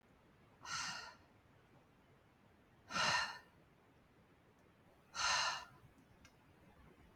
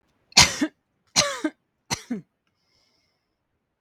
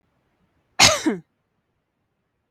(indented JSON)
{
  "exhalation_length": "7.2 s",
  "exhalation_amplitude": 2243,
  "exhalation_signal_mean_std_ratio": 0.39,
  "three_cough_length": "3.8 s",
  "three_cough_amplitude": 32768,
  "three_cough_signal_mean_std_ratio": 0.27,
  "cough_length": "2.5 s",
  "cough_amplitude": 32768,
  "cough_signal_mean_std_ratio": 0.25,
  "survey_phase": "beta (2021-08-13 to 2022-03-07)",
  "age": "18-44",
  "gender": "Female",
  "wearing_mask": "No",
  "symptom_none": true,
  "symptom_onset": "8 days",
  "smoker_status": "Never smoked",
  "respiratory_condition_asthma": false,
  "respiratory_condition_other": false,
  "recruitment_source": "REACT",
  "submission_delay": "1 day",
  "covid_test_result": "Negative",
  "covid_test_method": "RT-qPCR",
  "influenza_a_test_result": "Unknown/Void",
  "influenza_b_test_result": "Unknown/Void"
}